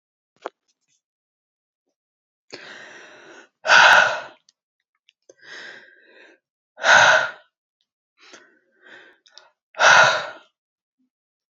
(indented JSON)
{
  "exhalation_length": "11.5 s",
  "exhalation_amplitude": 31141,
  "exhalation_signal_mean_std_ratio": 0.29,
  "survey_phase": "alpha (2021-03-01 to 2021-08-12)",
  "age": "18-44",
  "gender": "Female",
  "wearing_mask": "No",
  "symptom_cough_any": true,
  "symptom_new_continuous_cough": true,
  "symptom_fatigue": true,
  "symptom_onset": "4 days",
  "smoker_status": "Never smoked",
  "respiratory_condition_asthma": false,
  "respiratory_condition_other": false,
  "recruitment_source": "Test and Trace",
  "submission_delay": "1 day",
  "covid_test_result": "Positive",
  "covid_test_method": "RT-qPCR",
  "covid_ct_value": 29.8,
  "covid_ct_gene": "ORF1ab gene"
}